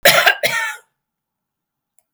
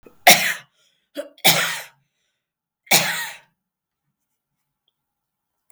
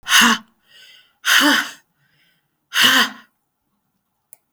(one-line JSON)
{"cough_length": "2.1 s", "cough_amplitude": 32768, "cough_signal_mean_std_ratio": 0.39, "three_cough_length": "5.7 s", "three_cough_amplitude": 32768, "three_cough_signal_mean_std_ratio": 0.28, "exhalation_length": "4.5 s", "exhalation_amplitude": 32768, "exhalation_signal_mean_std_ratio": 0.4, "survey_phase": "beta (2021-08-13 to 2022-03-07)", "age": "65+", "gender": "Female", "wearing_mask": "No", "symptom_cough_any": true, "smoker_status": "Prefer not to say", "respiratory_condition_asthma": false, "respiratory_condition_other": false, "recruitment_source": "REACT", "submission_delay": "2 days", "covid_test_result": "Negative", "covid_test_method": "RT-qPCR", "influenza_a_test_result": "Negative", "influenza_b_test_result": "Negative"}